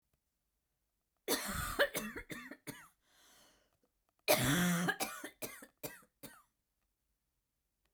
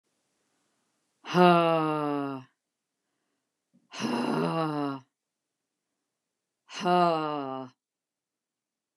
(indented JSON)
{
  "cough_length": "7.9 s",
  "cough_amplitude": 5264,
  "cough_signal_mean_std_ratio": 0.38,
  "exhalation_length": "9.0 s",
  "exhalation_amplitude": 14152,
  "exhalation_signal_mean_std_ratio": 0.4,
  "survey_phase": "beta (2021-08-13 to 2022-03-07)",
  "age": "45-64",
  "gender": "Female",
  "wearing_mask": "No",
  "symptom_other": true,
  "symptom_onset": "8 days",
  "smoker_status": "Never smoked",
  "respiratory_condition_asthma": false,
  "respiratory_condition_other": false,
  "recruitment_source": "REACT",
  "submission_delay": "1 day",
  "covid_test_result": "Negative",
  "covid_test_method": "RT-qPCR"
}